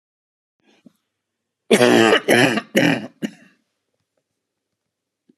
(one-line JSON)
{"cough_length": "5.4 s", "cough_amplitude": 32412, "cough_signal_mean_std_ratio": 0.35, "survey_phase": "alpha (2021-03-01 to 2021-08-12)", "age": "65+", "gender": "Male", "wearing_mask": "No", "symptom_none": true, "smoker_status": "Ex-smoker", "respiratory_condition_asthma": false, "respiratory_condition_other": true, "recruitment_source": "REACT", "submission_delay": "2 days", "covid_test_result": "Negative", "covid_test_method": "RT-qPCR"}